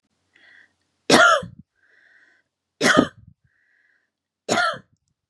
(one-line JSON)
{"three_cough_length": "5.3 s", "three_cough_amplitude": 32767, "three_cough_signal_mean_std_ratio": 0.31, "survey_phase": "beta (2021-08-13 to 2022-03-07)", "age": "18-44", "gender": "Female", "wearing_mask": "No", "symptom_fatigue": true, "symptom_onset": "12 days", "smoker_status": "Never smoked", "respiratory_condition_asthma": false, "respiratory_condition_other": false, "recruitment_source": "REACT", "submission_delay": "3 days", "covid_test_result": "Negative", "covid_test_method": "RT-qPCR", "influenza_a_test_result": "Negative", "influenza_b_test_result": "Negative"}